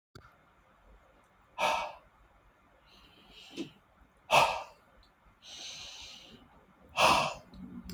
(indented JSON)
{
  "exhalation_length": "7.9 s",
  "exhalation_amplitude": 10863,
  "exhalation_signal_mean_std_ratio": 0.33,
  "survey_phase": "beta (2021-08-13 to 2022-03-07)",
  "age": "45-64",
  "gender": "Male",
  "wearing_mask": "No",
  "symptom_none": true,
  "smoker_status": "Never smoked",
  "respiratory_condition_asthma": false,
  "respiratory_condition_other": false,
  "recruitment_source": "REACT",
  "submission_delay": "4 days",
  "covid_test_result": "Negative",
  "covid_test_method": "RT-qPCR",
  "influenza_a_test_result": "Negative",
  "influenza_b_test_result": "Negative"
}